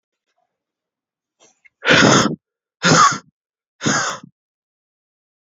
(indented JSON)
{
  "exhalation_length": "5.5 s",
  "exhalation_amplitude": 32560,
  "exhalation_signal_mean_std_ratio": 0.35,
  "survey_phase": "beta (2021-08-13 to 2022-03-07)",
  "age": "18-44",
  "gender": "Male",
  "wearing_mask": "No",
  "symptom_cough_any": true,
  "symptom_new_continuous_cough": true,
  "symptom_runny_or_blocked_nose": true,
  "symptom_shortness_of_breath": true,
  "symptom_sore_throat": true,
  "symptom_diarrhoea": true,
  "symptom_fatigue": true,
  "symptom_fever_high_temperature": true,
  "symptom_headache": true,
  "symptom_change_to_sense_of_smell_or_taste": true,
  "symptom_loss_of_taste": true,
  "smoker_status": "Never smoked",
  "respiratory_condition_asthma": false,
  "respiratory_condition_other": false,
  "recruitment_source": "Test and Trace",
  "submission_delay": "2 days",
  "covid_test_result": "Positive",
  "covid_test_method": "LFT"
}